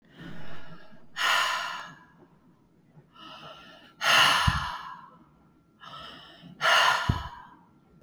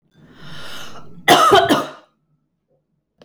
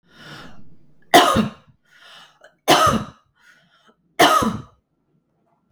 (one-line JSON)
{"exhalation_length": "8.0 s", "exhalation_amplitude": 13160, "exhalation_signal_mean_std_ratio": 0.49, "cough_length": "3.2 s", "cough_amplitude": 32768, "cough_signal_mean_std_ratio": 0.41, "three_cough_length": "5.7 s", "three_cough_amplitude": 32768, "three_cough_signal_mean_std_ratio": 0.36, "survey_phase": "beta (2021-08-13 to 2022-03-07)", "age": "45-64", "gender": "Female", "wearing_mask": "No", "symptom_none": true, "smoker_status": "Never smoked", "respiratory_condition_asthma": false, "respiratory_condition_other": false, "recruitment_source": "REACT", "submission_delay": "8 days", "covid_test_result": "Negative", "covid_test_method": "RT-qPCR", "influenza_a_test_result": "Negative", "influenza_b_test_result": "Negative"}